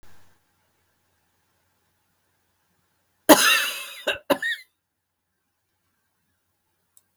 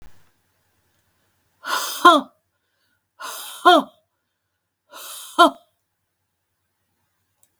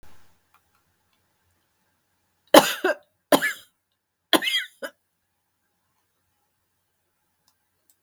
{
  "cough_length": "7.2 s",
  "cough_amplitude": 32768,
  "cough_signal_mean_std_ratio": 0.22,
  "exhalation_length": "7.6 s",
  "exhalation_amplitude": 32768,
  "exhalation_signal_mean_std_ratio": 0.24,
  "three_cough_length": "8.0 s",
  "three_cough_amplitude": 32768,
  "three_cough_signal_mean_std_ratio": 0.2,
  "survey_phase": "beta (2021-08-13 to 2022-03-07)",
  "age": "65+",
  "gender": "Female",
  "wearing_mask": "No",
  "symptom_cough_any": true,
  "symptom_fatigue": true,
  "symptom_headache": true,
  "symptom_onset": "12 days",
  "smoker_status": "Ex-smoker",
  "respiratory_condition_asthma": false,
  "respiratory_condition_other": false,
  "recruitment_source": "REACT",
  "submission_delay": "1 day",
  "covid_test_result": "Negative",
  "covid_test_method": "RT-qPCR",
  "influenza_a_test_result": "Negative",
  "influenza_b_test_result": "Negative"
}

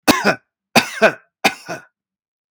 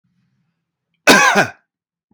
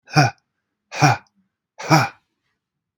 {
  "three_cough_length": "2.5 s",
  "three_cough_amplitude": 32767,
  "three_cough_signal_mean_std_ratio": 0.36,
  "cough_length": "2.1 s",
  "cough_amplitude": 32767,
  "cough_signal_mean_std_ratio": 0.35,
  "exhalation_length": "3.0 s",
  "exhalation_amplitude": 31582,
  "exhalation_signal_mean_std_ratio": 0.33,
  "survey_phase": "beta (2021-08-13 to 2022-03-07)",
  "age": "45-64",
  "gender": "Male",
  "wearing_mask": "No",
  "symptom_none": true,
  "smoker_status": "Never smoked",
  "respiratory_condition_asthma": false,
  "respiratory_condition_other": false,
  "recruitment_source": "REACT",
  "submission_delay": "1 day",
  "covid_test_result": "Negative",
  "covid_test_method": "RT-qPCR",
  "influenza_a_test_result": "Unknown/Void",
  "influenza_b_test_result": "Unknown/Void"
}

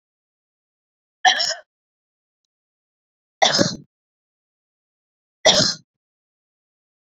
{
  "three_cough_length": "7.1 s",
  "three_cough_amplitude": 30816,
  "three_cough_signal_mean_std_ratio": 0.26,
  "survey_phase": "beta (2021-08-13 to 2022-03-07)",
  "age": "45-64",
  "gender": "Female",
  "wearing_mask": "No",
  "symptom_none": true,
  "smoker_status": "Never smoked",
  "respiratory_condition_asthma": true,
  "respiratory_condition_other": false,
  "recruitment_source": "REACT",
  "submission_delay": "1 day",
  "covid_test_result": "Negative",
  "covid_test_method": "RT-qPCR"
}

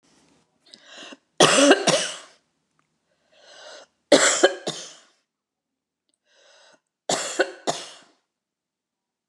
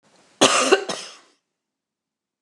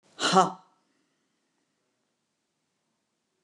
{
  "three_cough_length": "9.3 s",
  "three_cough_amplitude": 29203,
  "three_cough_signal_mean_std_ratio": 0.3,
  "cough_length": "2.4 s",
  "cough_amplitude": 29203,
  "cough_signal_mean_std_ratio": 0.33,
  "exhalation_length": "3.4 s",
  "exhalation_amplitude": 17012,
  "exhalation_signal_mean_std_ratio": 0.21,
  "survey_phase": "beta (2021-08-13 to 2022-03-07)",
  "age": "65+",
  "gender": "Female",
  "wearing_mask": "No",
  "symptom_none": true,
  "smoker_status": "Never smoked",
  "respiratory_condition_asthma": false,
  "respiratory_condition_other": false,
  "recruitment_source": "REACT",
  "submission_delay": "2 days",
  "covid_test_result": "Negative",
  "covid_test_method": "RT-qPCR"
}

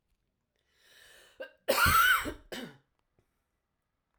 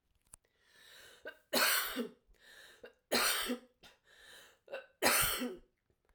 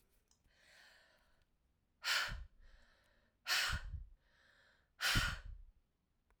{
  "cough_length": "4.2 s",
  "cough_amplitude": 7562,
  "cough_signal_mean_std_ratio": 0.34,
  "three_cough_length": "6.1 s",
  "three_cough_amplitude": 7456,
  "three_cough_signal_mean_std_ratio": 0.43,
  "exhalation_length": "6.4 s",
  "exhalation_amplitude": 2712,
  "exhalation_signal_mean_std_ratio": 0.38,
  "survey_phase": "alpha (2021-03-01 to 2021-08-12)",
  "age": "45-64",
  "gender": "Female",
  "wearing_mask": "No",
  "symptom_cough_any": true,
  "symptom_fatigue": true,
  "symptom_fever_high_temperature": true,
  "symptom_headache": true,
  "symptom_onset": "2 days",
  "smoker_status": "Never smoked",
  "respiratory_condition_asthma": false,
  "respiratory_condition_other": false,
  "recruitment_source": "Test and Trace",
  "submission_delay": "1 day",
  "covid_test_result": "Positive",
  "covid_test_method": "RT-qPCR"
}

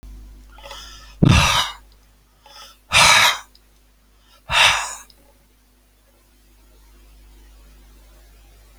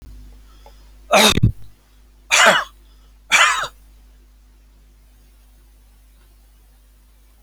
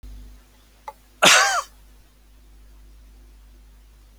{
  "exhalation_length": "8.8 s",
  "exhalation_amplitude": 32175,
  "exhalation_signal_mean_std_ratio": 0.34,
  "three_cough_length": "7.4 s",
  "three_cough_amplitude": 32390,
  "three_cough_signal_mean_std_ratio": 0.34,
  "cough_length": "4.2 s",
  "cough_amplitude": 29358,
  "cough_signal_mean_std_ratio": 0.29,
  "survey_phase": "alpha (2021-03-01 to 2021-08-12)",
  "age": "65+",
  "gender": "Male",
  "wearing_mask": "No",
  "symptom_none": true,
  "smoker_status": "Never smoked",
  "respiratory_condition_asthma": false,
  "respiratory_condition_other": false,
  "recruitment_source": "REACT",
  "submission_delay": "1 day",
  "covid_test_result": "Negative",
  "covid_test_method": "RT-qPCR"
}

